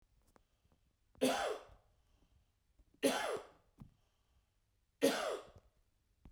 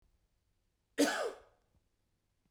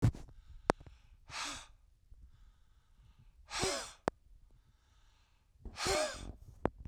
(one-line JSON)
{"three_cough_length": "6.3 s", "three_cough_amplitude": 4042, "three_cough_signal_mean_std_ratio": 0.34, "cough_length": "2.5 s", "cough_amplitude": 4318, "cough_signal_mean_std_ratio": 0.28, "exhalation_length": "6.9 s", "exhalation_amplitude": 12958, "exhalation_signal_mean_std_ratio": 0.35, "survey_phase": "beta (2021-08-13 to 2022-03-07)", "age": "45-64", "gender": "Male", "wearing_mask": "No", "symptom_none": true, "smoker_status": "Ex-smoker", "respiratory_condition_asthma": false, "respiratory_condition_other": false, "recruitment_source": "REACT", "submission_delay": "2 days", "covid_test_result": "Negative", "covid_test_method": "RT-qPCR", "influenza_a_test_result": "Negative", "influenza_b_test_result": "Negative"}